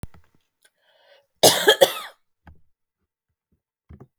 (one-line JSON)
{"cough_length": "4.2 s", "cough_amplitude": 32768, "cough_signal_mean_std_ratio": 0.23, "survey_phase": "beta (2021-08-13 to 2022-03-07)", "age": "45-64", "gender": "Female", "wearing_mask": "No", "symptom_none": true, "smoker_status": "Never smoked", "respiratory_condition_asthma": false, "respiratory_condition_other": false, "recruitment_source": "REACT", "submission_delay": "1 day", "covid_test_result": "Negative", "covid_test_method": "RT-qPCR"}